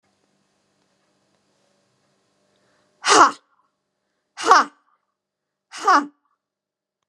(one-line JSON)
{"exhalation_length": "7.1 s", "exhalation_amplitude": 32767, "exhalation_signal_mean_std_ratio": 0.23, "survey_phase": "beta (2021-08-13 to 2022-03-07)", "age": "45-64", "gender": "Female", "wearing_mask": "No", "symptom_none": true, "smoker_status": "Never smoked", "respiratory_condition_asthma": false, "respiratory_condition_other": false, "recruitment_source": "REACT", "submission_delay": "1 day", "covid_test_result": "Negative", "covid_test_method": "RT-qPCR"}